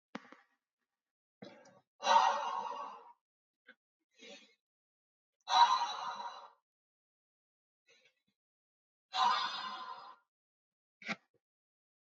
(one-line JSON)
{"exhalation_length": "12.1 s", "exhalation_amplitude": 6995, "exhalation_signal_mean_std_ratio": 0.31, "survey_phase": "beta (2021-08-13 to 2022-03-07)", "age": "18-44", "gender": "Male", "wearing_mask": "No", "symptom_none": true, "smoker_status": "Never smoked", "respiratory_condition_asthma": false, "respiratory_condition_other": false, "recruitment_source": "Test and Trace", "submission_delay": "2 days", "covid_test_result": "Positive", "covid_test_method": "ePCR"}